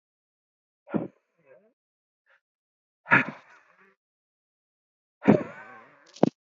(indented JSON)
{
  "exhalation_length": "6.6 s",
  "exhalation_amplitude": 23783,
  "exhalation_signal_mean_std_ratio": 0.19,
  "survey_phase": "beta (2021-08-13 to 2022-03-07)",
  "age": "18-44",
  "gender": "Male",
  "wearing_mask": "No",
  "symptom_sore_throat": true,
  "symptom_onset": "13 days",
  "smoker_status": "Ex-smoker",
  "respiratory_condition_asthma": true,
  "respiratory_condition_other": false,
  "recruitment_source": "REACT",
  "submission_delay": "3 days",
  "covid_test_result": "Negative",
  "covid_test_method": "RT-qPCR",
  "influenza_a_test_result": "Negative",
  "influenza_b_test_result": "Negative"
}